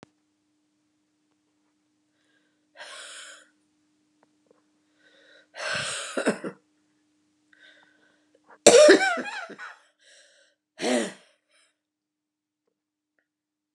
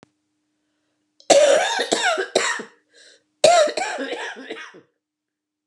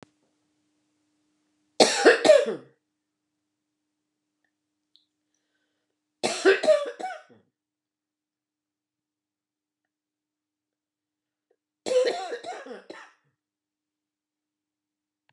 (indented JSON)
{
  "exhalation_length": "13.7 s",
  "exhalation_amplitude": 32746,
  "exhalation_signal_mean_std_ratio": 0.22,
  "cough_length": "5.7 s",
  "cough_amplitude": 31365,
  "cough_signal_mean_std_ratio": 0.45,
  "three_cough_length": "15.3 s",
  "three_cough_amplitude": 28382,
  "three_cough_signal_mean_std_ratio": 0.24,
  "survey_phase": "beta (2021-08-13 to 2022-03-07)",
  "age": "65+",
  "gender": "Female",
  "wearing_mask": "No",
  "symptom_cough_any": true,
  "symptom_runny_or_blocked_nose": true,
  "symptom_diarrhoea": true,
  "symptom_fatigue": true,
  "symptom_fever_high_temperature": true,
  "symptom_headache": true,
  "smoker_status": "Ex-smoker",
  "respiratory_condition_asthma": false,
  "respiratory_condition_other": false,
  "recruitment_source": "Test and Trace",
  "submission_delay": "3 days",
  "covid_test_result": "Positive",
  "covid_test_method": "LFT"
}